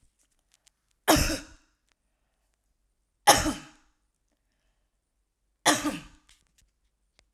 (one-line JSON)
{"cough_length": "7.3 s", "cough_amplitude": 23019, "cough_signal_mean_std_ratio": 0.24, "survey_phase": "alpha (2021-03-01 to 2021-08-12)", "age": "45-64", "gender": "Female", "wearing_mask": "No", "symptom_none": true, "smoker_status": "Never smoked", "respiratory_condition_asthma": false, "respiratory_condition_other": false, "recruitment_source": "REACT", "submission_delay": "10 days", "covid_test_result": "Negative", "covid_test_method": "RT-qPCR"}